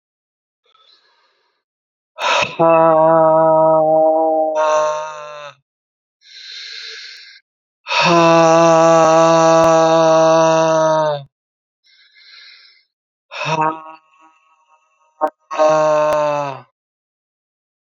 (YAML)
exhalation_length: 17.8 s
exhalation_amplitude: 28735
exhalation_signal_mean_std_ratio: 0.6
survey_phase: alpha (2021-03-01 to 2021-08-12)
age: 45-64
gender: Male
wearing_mask: 'No'
symptom_new_continuous_cough: true
symptom_fatigue: true
symptom_headache: true
symptom_loss_of_taste: true
symptom_onset: 4 days
smoker_status: Never smoked
respiratory_condition_asthma: false
respiratory_condition_other: false
recruitment_source: Test and Trace
submission_delay: 1 day
covid_test_result: Positive
covid_test_method: RT-qPCR
covid_ct_value: 15.4
covid_ct_gene: ORF1ab gene
covid_ct_mean: 16.6
covid_viral_load: 3600000 copies/ml
covid_viral_load_category: High viral load (>1M copies/ml)